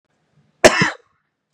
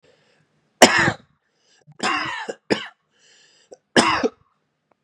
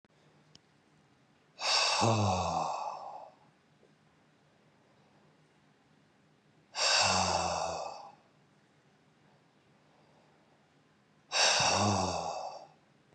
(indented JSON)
{
  "cough_length": "1.5 s",
  "cough_amplitude": 32768,
  "cough_signal_mean_std_ratio": 0.28,
  "three_cough_length": "5.0 s",
  "three_cough_amplitude": 32768,
  "three_cough_signal_mean_std_ratio": 0.32,
  "exhalation_length": "13.1 s",
  "exhalation_amplitude": 6442,
  "exhalation_signal_mean_std_ratio": 0.46,
  "survey_phase": "beta (2021-08-13 to 2022-03-07)",
  "age": "18-44",
  "gender": "Male",
  "wearing_mask": "No",
  "symptom_none": true,
  "smoker_status": "Never smoked",
  "respiratory_condition_asthma": false,
  "respiratory_condition_other": false,
  "recruitment_source": "REACT",
  "submission_delay": "4 days",
  "covid_test_result": "Negative",
  "covid_test_method": "RT-qPCR",
  "influenza_a_test_result": "Negative",
  "influenza_b_test_result": "Negative"
}